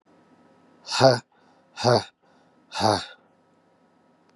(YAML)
exhalation_length: 4.4 s
exhalation_amplitude: 21636
exhalation_signal_mean_std_ratio: 0.31
survey_phase: beta (2021-08-13 to 2022-03-07)
age: 45-64
gender: Male
wearing_mask: 'No'
symptom_new_continuous_cough: true
symptom_runny_or_blocked_nose: true
symptom_fatigue: true
symptom_fever_high_temperature: true
symptom_headache: true
symptom_change_to_sense_of_smell_or_taste: true
symptom_loss_of_taste: true
smoker_status: Never smoked
respiratory_condition_asthma: false
respiratory_condition_other: false
recruitment_source: Test and Trace
submission_delay: 2 days
covid_test_result: Positive
covid_test_method: RT-qPCR
covid_ct_value: 20.4
covid_ct_gene: N gene